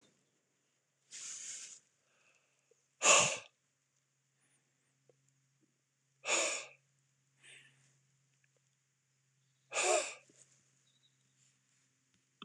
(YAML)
exhalation_length: 12.4 s
exhalation_amplitude: 8443
exhalation_signal_mean_std_ratio: 0.24
survey_phase: beta (2021-08-13 to 2022-03-07)
age: 45-64
gender: Male
wearing_mask: 'No'
symptom_cough_any: true
symptom_shortness_of_breath: true
symptom_diarrhoea: true
symptom_fatigue: true
symptom_headache: true
symptom_onset: 5 days
smoker_status: Never smoked
respiratory_condition_asthma: false
respiratory_condition_other: false
recruitment_source: Test and Trace
submission_delay: 2 days
covid_test_result: Positive
covid_test_method: RT-qPCR
covid_ct_value: 29.6
covid_ct_gene: ORF1ab gene